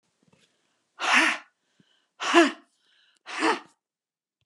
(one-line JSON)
{"exhalation_length": "4.5 s", "exhalation_amplitude": 16389, "exhalation_signal_mean_std_ratio": 0.33, "survey_phase": "beta (2021-08-13 to 2022-03-07)", "age": "65+", "gender": "Female", "wearing_mask": "No", "symptom_none": true, "smoker_status": "Ex-smoker", "respiratory_condition_asthma": false, "respiratory_condition_other": false, "recruitment_source": "REACT", "submission_delay": "1 day", "covid_test_result": "Negative", "covid_test_method": "RT-qPCR"}